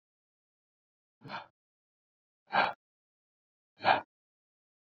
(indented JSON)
{
  "exhalation_length": "4.9 s",
  "exhalation_amplitude": 9000,
  "exhalation_signal_mean_std_ratio": 0.21,
  "survey_phase": "beta (2021-08-13 to 2022-03-07)",
  "age": "18-44",
  "gender": "Male",
  "wearing_mask": "No",
  "symptom_sore_throat": true,
  "symptom_onset": "6 days",
  "smoker_status": "Never smoked",
  "respiratory_condition_asthma": false,
  "respiratory_condition_other": false,
  "recruitment_source": "REACT",
  "submission_delay": "2 days",
  "covid_test_result": "Negative",
  "covid_test_method": "RT-qPCR"
}